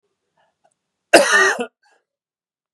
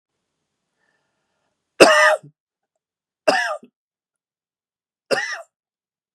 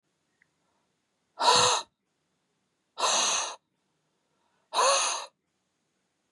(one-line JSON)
{"cough_length": "2.7 s", "cough_amplitude": 32768, "cough_signal_mean_std_ratio": 0.31, "three_cough_length": "6.1 s", "three_cough_amplitude": 32768, "three_cough_signal_mean_std_ratio": 0.26, "exhalation_length": "6.3 s", "exhalation_amplitude": 12387, "exhalation_signal_mean_std_ratio": 0.38, "survey_phase": "beta (2021-08-13 to 2022-03-07)", "age": "45-64", "gender": "Male", "wearing_mask": "No", "symptom_cough_any": true, "symptom_fatigue": true, "symptom_change_to_sense_of_smell_or_taste": true, "symptom_loss_of_taste": true, "symptom_onset": "6 days", "smoker_status": "Ex-smoker", "respiratory_condition_asthma": false, "respiratory_condition_other": false, "recruitment_source": "Test and Trace", "submission_delay": "2 days", "covid_test_result": "Positive", "covid_test_method": "RT-qPCR", "covid_ct_value": 17.1, "covid_ct_gene": "ORF1ab gene", "covid_ct_mean": 17.5, "covid_viral_load": "1800000 copies/ml", "covid_viral_load_category": "High viral load (>1M copies/ml)"}